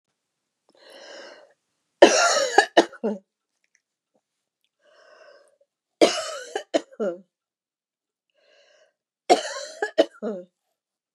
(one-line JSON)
{"three_cough_length": "11.1 s", "three_cough_amplitude": 32768, "three_cough_signal_mean_std_ratio": 0.27, "survey_phase": "beta (2021-08-13 to 2022-03-07)", "age": "45-64", "gender": "Female", "wearing_mask": "No", "symptom_none": true, "smoker_status": "Never smoked", "respiratory_condition_asthma": false, "respiratory_condition_other": false, "recruitment_source": "REACT", "submission_delay": "3 days", "covid_test_result": "Negative", "covid_test_method": "RT-qPCR", "influenza_a_test_result": "Negative", "influenza_b_test_result": "Negative"}